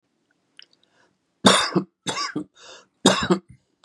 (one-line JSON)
{"three_cough_length": "3.8 s", "three_cough_amplitude": 32755, "three_cough_signal_mean_std_ratio": 0.35, "survey_phase": "beta (2021-08-13 to 2022-03-07)", "age": "45-64", "gender": "Male", "wearing_mask": "No", "symptom_runny_or_blocked_nose": true, "symptom_onset": "5 days", "smoker_status": "Never smoked", "respiratory_condition_asthma": false, "respiratory_condition_other": false, "recruitment_source": "REACT", "submission_delay": "2 days", "covid_test_result": "Negative", "covid_test_method": "RT-qPCR", "influenza_a_test_result": "Negative", "influenza_b_test_result": "Negative"}